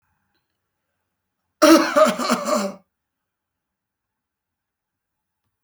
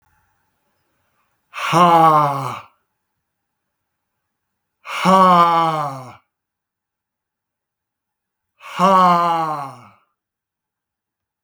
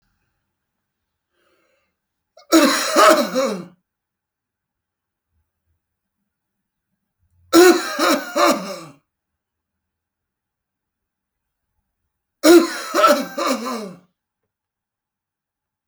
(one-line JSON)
{"cough_length": "5.6 s", "cough_amplitude": 30336, "cough_signal_mean_std_ratio": 0.29, "exhalation_length": "11.4 s", "exhalation_amplitude": 29624, "exhalation_signal_mean_std_ratio": 0.39, "three_cough_length": "15.9 s", "three_cough_amplitude": 32563, "three_cough_signal_mean_std_ratio": 0.32, "survey_phase": "beta (2021-08-13 to 2022-03-07)", "age": "45-64", "gender": "Male", "wearing_mask": "Yes", "symptom_none": true, "smoker_status": "Ex-smoker", "respiratory_condition_asthma": true, "respiratory_condition_other": false, "recruitment_source": "REACT", "submission_delay": "2 days", "covid_test_result": "Negative", "covid_test_method": "RT-qPCR"}